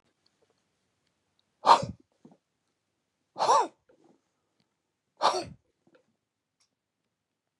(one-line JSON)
{"exhalation_length": "7.6 s", "exhalation_amplitude": 17726, "exhalation_signal_mean_std_ratio": 0.22, "survey_phase": "beta (2021-08-13 to 2022-03-07)", "age": "45-64", "gender": "Male", "wearing_mask": "No", "symptom_none": true, "smoker_status": "Ex-smoker", "respiratory_condition_asthma": true, "respiratory_condition_other": false, "recruitment_source": "Test and Trace", "submission_delay": "2 days", "covid_test_result": "Negative", "covid_test_method": "ePCR"}